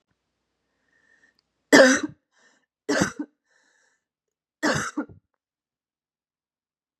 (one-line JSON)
{"three_cough_length": "7.0 s", "three_cough_amplitude": 32651, "three_cough_signal_mean_std_ratio": 0.24, "survey_phase": "beta (2021-08-13 to 2022-03-07)", "age": "18-44", "gender": "Female", "wearing_mask": "No", "symptom_cough_any": true, "symptom_shortness_of_breath": true, "symptom_sore_throat": true, "symptom_headache": true, "symptom_onset": "1 day", "smoker_status": "Never smoked", "respiratory_condition_asthma": true, "respiratory_condition_other": false, "recruitment_source": "Test and Trace", "submission_delay": "1 day", "covid_test_result": "Positive", "covid_test_method": "RT-qPCR", "covid_ct_value": 36.8, "covid_ct_gene": "N gene"}